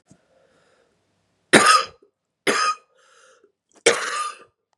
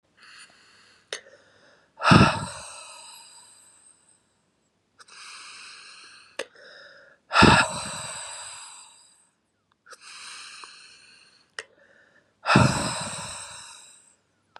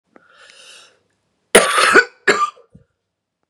{"three_cough_length": "4.8 s", "three_cough_amplitude": 32768, "three_cough_signal_mean_std_ratio": 0.33, "exhalation_length": "14.6 s", "exhalation_amplitude": 27519, "exhalation_signal_mean_std_ratio": 0.29, "cough_length": "3.5 s", "cough_amplitude": 32768, "cough_signal_mean_std_ratio": 0.34, "survey_phase": "beta (2021-08-13 to 2022-03-07)", "age": "18-44", "gender": "Female", "wearing_mask": "No", "symptom_cough_any": true, "symptom_runny_or_blocked_nose": true, "symptom_shortness_of_breath": true, "symptom_sore_throat": true, "symptom_fatigue": true, "symptom_fever_high_temperature": true, "symptom_headache": true, "symptom_change_to_sense_of_smell_or_taste": true, "symptom_loss_of_taste": true, "symptom_onset": "3 days", "smoker_status": "Ex-smoker", "respiratory_condition_asthma": false, "respiratory_condition_other": false, "recruitment_source": "Test and Trace", "submission_delay": "2 days", "covid_test_result": "Positive", "covid_test_method": "RT-qPCR", "covid_ct_value": 21.8, "covid_ct_gene": "ORF1ab gene", "covid_ct_mean": 22.4, "covid_viral_load": "45000 copies/ml", "covid_viral_load_category": "Low viral load (10K-1M copies/ml)"}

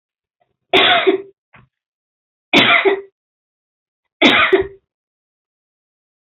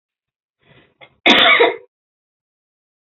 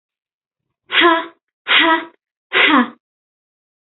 {"three_cough_length": "6.3 s", "three_cough_amplitude": 31839, "three_cough_signal_mean_std_ratio": 0.37, "cough_length": "3.2 s", "cough_amplitude": 30824, "cough_signal_mean_std_ratio": 0.32, "exhalation_length": "3.8 s", "exhalation_amplitude": 29368, "exhalation_signal_mean_std_ratio": 0.42, "survey_phase": "beta (2021-08-13 to 2022-03-07)", "age": "18-44", "gender": "Female", "wearing_mask": "No", "symptom_cough_any": true, "symptom_runny_or_blocked_nose": true, "symptom_sore_throat": true, "symptom_headache": true, "symptom_onset": "2 days", "smoker_status": "Never smoked", "respiratory_condition_asthma": false, "respiratory_condition_other": false, "recruitment_source": "Test and Trace", "submission_delay": "1 day", "covid_test_result": "Negative", "covid_test_method": "RT-qPCR"}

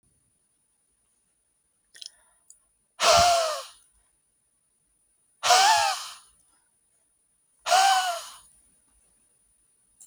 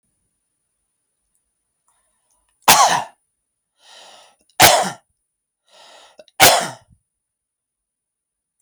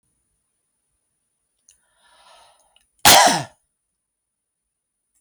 {"exhalation_length": "10.1 s", "exhalation_amplitude": 16773, "exhalation_signal_mean_std_ratio": 0.34, "three_cough_length": "8.6 s", "three_cough_amplitude": 32768, "three_cough_signal_mean_std_ratio": 0.25, "cough_length": "5.2 s", "cough_amplitude": 32767, "cough_signal_mean_std_ratio": 0.2, "survey_phase": "beta (2021-08-13 to 2022-03-07)", "age": "45-64", "gender": "Male", "wearing_mask": "No", "symptom_none": true, "smoker_status": "Never smoked", "respiratory_condition_asthma": false, "respiratory_condition_other": false, "recruitment_source": "REACT", "submission_delay": "2 days", "covid_test_result": "Negative", "covid_test_method": "RT-qPCR"}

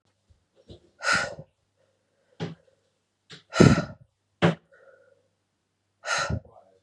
{"exhalation_length": "6.8 s", "exhalation_amplitude": 30952, "exhalation_signal_mean_std_ratio": 0.27, "survey_phase": "beta (2021-08-13 to 2022-03-07)", "age": "18-44", "gender": "Female", "wearing_mask": "No", "symptom_cough_any": true, "symptom_new_continuous_cough": true, "symptom_runny_or_blocked_nose": true, "symptom_shortness_of_breath": true, "symptom_sore_throat": true, "symptom_fatigue": true, "symptom_change_to_sense_of_smell_or_taste": true, "symptom_loss_of_taste": true, "symptom_other": true, "symptom_onset": "4 days", "smoker_status": "Ex-smoker", "respiratory_condition_asthma": false, "respiratory_condition_other": false, "recruitment_source": "Test and Trace", "submission_delay": "2 days", "covid_test_result": "Positive", "covid_test_method": "RT-qPCR", "covid_ct_value": 21.4, "covid_ct_gene": "ORF1ab gene"}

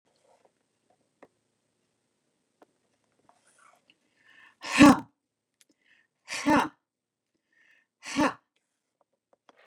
{"exhalation_length": "9.7 s", "exhalation_amplitude": 23457, "exhalation_signal_mean_std_ratio": 0.19, "survey_phase": "beta (2021-08-13 to 2022-03-07)", "age": "65+", "gender": "Female", "wearing_mask": "No", "symptom_none": true, "smoker_status": "Never smoked", "respiratory_condition_asthma": false, "respiratory_condition_other": false, "recruitment_source": "REACT", "submission_delay": "2 days", "covid_test_result": "Negative", "covid_test_method": "RT-qPCR", "influenza_a_test_result": "Negative", "influenza_b_test_result": "Negative"}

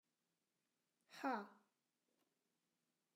{"exhalation_length": "3.2 s", "exhalation_amplitude": 969, "exhalation_signal_mean_std_ratio": 0.23, "survey_phase": "alpha (2021-03-01 to 2021-08-12)", "age": "65+", "gender": "Female", "wearing_mask": "No", "symptom_none": true, "smoker_status": "Ex-smoker", "respiratory_condition_asthma": false, "respiratory_condition_other": false, "recruitment_source": "REACT", "submission_delay": "4 days", "covid_test_result": "Negative", "covid_test_method": "RT-qPCR"}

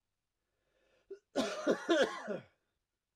{"cough_length": "3.2 s", "cough_amplitude": 4632, "cough_signal_mean_std_ratio": 0.39, "survey_phase": "alpha (2021-03-01 to 2021-08-12)", "age": "45-64", "gender": "Male", "wearing_mask": "No", "symptom_cough_any": true, "symptom_fatigue": true, "symptom_headache": true, "symptom_change_to_sense_of_smell_or_taste": true, "symptom_loss_of_taste": true, "symptom_onset": "3 days", "smoker_status": "Never smoked", "respiratory_condition_asthma": false, "respiratory_condition_other": false, "recruitment_source": "Test and Trace", "submission_delay": "2 days", "covid_test_result": "Positive", "covid_test_method": "RT-qPCR", "covid_ct_value": 16.7, "covid_ct_gene": "ORF1ab gene"}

